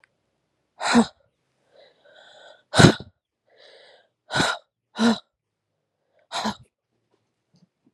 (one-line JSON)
{"exhalation_length": "7.9 s", "exhalation_amplitude": 32768, "exhalation_signal_mean_std_ratio": 0.25, "survey_phase": "beta (2021-08-13 to 2022-03-07)", "age": "18-44", "gender": "Female", "wearing_mask": "No", "symptom_cough_any": true, "symptom_runny_or_blocked_nose": true, "symptom_shortness_of_breath": true, "symptom_fatigue": true, "symptom_fever_high_temperature": true, "symptom_headache": true, "symptom_change_to_sense_of_smell_or_taste": true, "symptom_loss_of_taste": true, "symptom_other": true, "symptom_onset": "2 days", "smoker_status": "Ex-smoker", "respiratory_condition_asthma": false, "respiratory_condition_other": false, "recruitment_source": "Test and Trace", "submission_delay": "2 days", "covid_test_result": "Positive", "covid_test_method": "RT-qPCR", "covid_ct_value": 16.8, "covid_ct_gene": "S gene", "covid_ct_mean": 17.6, "covid_viral_load": "1700000 copies/ml", "covid_viral_load_category": "High viral load (>1M copies/ml)"}